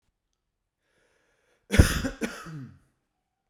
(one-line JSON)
{"cough_length": "3.5 s", "cough_amplitude": 27821, "cough_signal_mean_std_ratio": 0.24, "survey_phase": "beta (2021-08-13 to 2022-03-07)", "age": "45-64", "gender": "Male", "wearing_mask": "No", "symptom_none": true, "smoker_status": "Current smoker (1 to 10 cigarettes per day)", "respiratory_condition_asthma": false, "respiratory_condition_other": false, "recruitment_source": "REACT", "submission_delay": "2 days", "covid_test_result": "Negative", "covid_test_method": "RT-qPCR"}